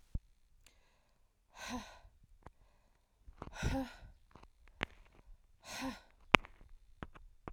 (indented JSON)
{
  "exhalation_length": "7.5 s",
  "exhalation_amplitude": 32767,
  "exhalation_signal_mean_std_ratio": 0.25,
  "survey_phase": "alpha (2021-03-01 to 2021-08-12)",
  "age": "18-44",
  "gender": "Female",
  "wearing_mask": "No",
  "symptom_none": true,
  "smoker_status": "Ex-smoker",
  "respiratory_condition_asthma": false,
  "respiratory_condition_other": false,
  "recruitment_source": "REACT",
  "submission_delay": "1 day",
  "covid_test_result": "Negative",
  "covid_test_method": "RT-qPCR"
}